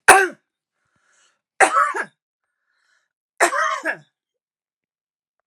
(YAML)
three_cough_length: 5.5 s
three_cough_amplitude: 32768
three_cough_signal_mean_std_ratio: 0.3
survey_phase: beta (2021-08-13 to 2022-03-07)
age: 65+
gender: Female
wearing_mask: 'No'
symptom_none: true
smoker_status: Never smoked
respiratory_condition_asthma: false
respiratory_condition_other: false
recruitment_source: REACT
submission_delay: 1 day
covid_test_result: Negative
covid_test_method: RT-qPCR
influenza_a_test_result: Negative
influenza_b_test_result: Negative